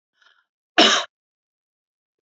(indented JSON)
{
  "cough_length": "2.2 s",
  "cough_amplitude": 30577,
  "cough_signal_mean_std_ratio": 0.25,
  "survey_phase": "alpha (2021-03-01 to 2021-08-12)",
  "age": "45-64",
  "gender": "Female",
  "wearing_mask": "No",
  "symptom_none": true,
  "symptom_onset": "12 days",
  "smoker_status": "Never smoked",
  "respiratory_condition_asthma": false,
  "respiratory_condition_other": false,
  "recruitment_source": "REACT",
  "submission_delay": "2 days",
  "covid_test_result": "Negative",
  "covid_test_method": "RT-qPCR"
}